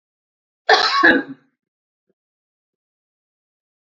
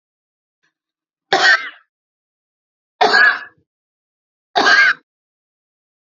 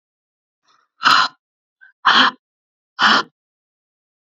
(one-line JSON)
{"cough_length": "3.9 s", "cough_amplitude": 30810, "cough_signal_mean_std_ratio": 0.28, "three_cough_length": "6.1 s", "three_cough_amplitude": 32768, "three_cough_signal_mean_std_ratio": 0.34, "exhalation_length": "4.3 s", "exhalation_amplitude": 29314, "exhalation_signal_mean_std_ratio": 0.33, "survey_phase": "beta (2021-08-13 to 2022-03-07)", "age": "45-64", "gender": "Female", "wearing_mask": "No", "symptom_runny_or_blocked_nose": true, "symptom_sore_throat": true, "symptom_headache": true, "symptom_onset": "7 days", "smoker_status": "Ex-smoker", "respiratory_condition_asthma": false, "respiratory_condition_other": false, "recruitment_source": "REACT", "submission_delay": "7 days", "covid_test_result": "Negative", "covid_test_method": "RT-qPCR"}